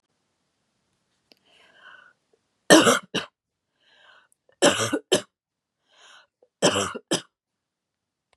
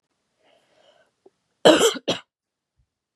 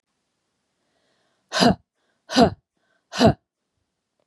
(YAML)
three_cough_length: 8.4 s
three_cough_amplitude: 31867
three_cough_signal_mean_std_ratio: 0.26
cough_length: 3.2 s
cough_amplitude: 32423
cough_signal_mean_std_ratio: 0.25
exhalation_length: 4.3 s
exhalation_amplitude: 31433
exhalation_signal_mean_std_ratio: 0.27
survey_phase: beta (2021-08-13 to 2022-03-07)
age: 45-64
gender: Female
wearing_mask: 'No'
symptom_none: true
smoker_status: Never smoked
respiratory_condition_asthma: false
respiratory_condition_other: false
recruitment_source: REACT
submission_delay: 2 days
covid_test_result: Negative
covid_test_method: RT-qPCR